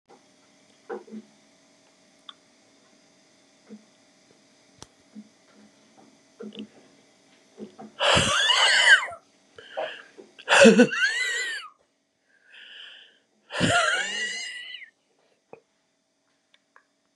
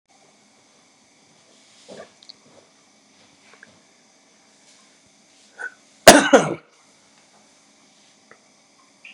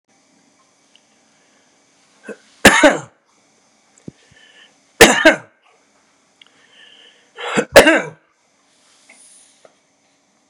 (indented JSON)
{
  "exhalation_length": "17.2 s",
  "exhalation_amplitude": 28472,
  "exhalation_signal_mean_std_ratio": 0.33,
  "cough_length": "9.1 s",
  "cough_amplitude": 32768,
  "cough_signal_mean_std_ratio": 0.16,
  "three_cough_length": "10.5 s",
  "three_cough_amplitude": 32768,
  "three_cough_signal_mean_std_ratio": 0.24,
  "survey_phase": "beta (2021-08-13 to 2022-03-07)",
  "age": "65+",
  "gender": "Male",
  "wearing_mask": "No",
  "symptom_none": true,
  "smoker_status": "Never smoked",
  "respiratory_condition_asthma": false,
  "respiratory_condition_other": false,
  "recruitment_source": "REACT",
  "submission_delay": "0 days",
  "covid_test_result": "Negative",
  "covid_test_method": "RT-qPCR",
  "influenza_a_test_result": "Negative",
  "influenza_b_test_result": "Negative"
}